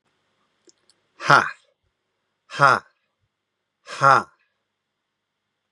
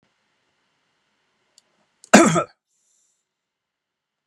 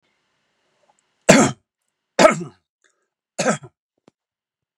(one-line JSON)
{"exhalation_length": "5.7 s", "exhalation_amplitude": 32724, "exhalation_signal_mean_std_ratio": 0.24, "cough_length": "4.3 s", "cough_amplitude": 32768, "cough_signal_mean_std_ratio": 0.19, "three_cough_length": "4.8 s", "three_cough_amplitude": 32768, "three_cough_signal_mean_std_ratio": 0.25, "survey_phase": "beta (2021-08-13 to 2022-03-07)", "age": "45-64", "gender": "Male", "wearing_mask": "No", "symptom_none": true, "smoker_status": "Never smoked", "respiratory_condition_asthma": false, "respiratory_condition_other": false, "recruitment_source": "REACT", "submission_delay": "2 days", "covid_test_result": "Negative", "covid_test_method": "RT-qPCR", "influenza_a_test_result": "Negative", "influenza_b_test_result": "Negative"}